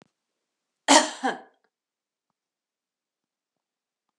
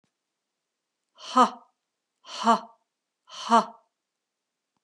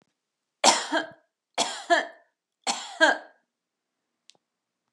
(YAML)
cough_length: 4.2 s
cough_amplitude: 24907
cough_signal_mean_std_ratio: 0.19
exhalation_length: 4.8 s
exhalation_amplitude: 15614
exhalation_signal_mean_std_ratio: 0.25
three_cough_length: 4.9 s
three_cough_amplitude: 23080
three_cough_signal_mean_std_ratio: 0.32
survey_phase: beta (2021-08-13 to 2022-03-07)
age: 45-64
gender: Female
wearing_mask: 'No'
symptom_none: true
smoker_status: Never smoked
respiratory_condition_asthma: false
respiratory_condition_other: false
recruitment_source: REACT
submission_delay: 4 days
covid_test_result: Negative
covid_test_method: RT-qPCR
influenza_a_test_result: Unknown/Void
influenza_b_test_result: Unknown/Void